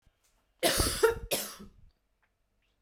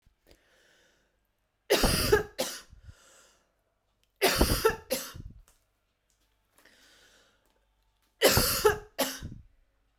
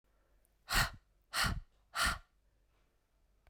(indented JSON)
{
  "cough_length": "2.8 s",
  "cough_amplitude": 9379,
  "cough_signal_mean_std_ratio": 0.39,
  "three_cough_length": "10.0 s",
  "three_cough_amplitude": 15131,
  "three_cough_signal_mean_std_ratio": 0.36,
  "exhalation_length": "3.5 s",
  "exhalation_amplitude": 4781,
  "exhalation_signal_mean_std_ratio": 0.36,
  "survey_phase": "beta (2021-08-13 to 2022-03-07)",
  "age": "18-44",
  "gender": "Female",
  "wearing_mask": "No",
  "symptom_cough_any": true,
  "symptom_runny_or_blocked_nose": true,
  "symptom_sore_throat": true,
  "symptom_abdominal_pain": true,
  "symptom_fatigue": true,
  "symptom_fever_high_temperature": true,
  "symptom_headache": true,
  "symptom_onset": "3 days",
  "smoker_status": "Current smoker (e-cigarettes or vapes only)",
  "respiratory_condition_asthma": false,
  "respiratory_condition_other": false,
  "recruitment_source": "Test and Trace",
  "submission_delay": "1 day",
  "covid_test_result": "Positive",
  "covid_test_method": "RT-qPCR",
  "covid_ct_value": 19.6,
  "covid_ct_gene": "ORF1ab gene",
  "covid_ct_mean": 20.4,
  "covid_viral_load": "210000 copies/ml",
  "covid_viral_load_category": "Low viral load (10K-1M copies/ml)"
}